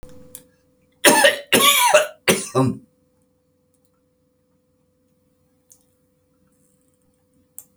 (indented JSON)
{
  "cough_length": "7.8 s",
  "cough_amplitude": 32767,
  "cough_signal_mean_std_ratio": 0.32,
  "survey_phase": "beta (2021-08-13 to 2022-03-07)",
  "age": "65+",
  "gender": "Male",
  "wearing_mask": "No",
  "symptom_none": true,
  "smoker_status": "Never smoked",
  "respiratory_condition_asthma": false,
  "respiratory_condition_other": false,
  "recruitment_source": "REACT",
  "submission_delay": "2 days",
  "covid_test_result": "Negative",
  "covid_test_method": "RT-qPCR"
}